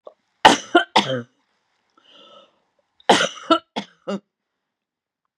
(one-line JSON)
{"cough_length": "5.4 s", "cough_amplitude": 32768, "cough_signal_mean_std_ratio": 0.28, "survey_phase": "beta (2021-08-13 to 2022-03-07)", "age": "65+", "gender": "Female", "wearing_mask": "No", "symptom_cough_any": true, "symptom_shortness_of_breath": true, "symptom_onset": "12 days", "smoker_status": "Never smoked", "respiratory_condition_asthma": false, "respiratory_condition_other": true, "recruitment_source": "REACT", "submission_delay": "2 days", "covid_test_result": "Negative", "covid_test_method": "RT-qPCR", "influenza_a_test_result": "Negative", "influenza_b_test_result": "Negative"}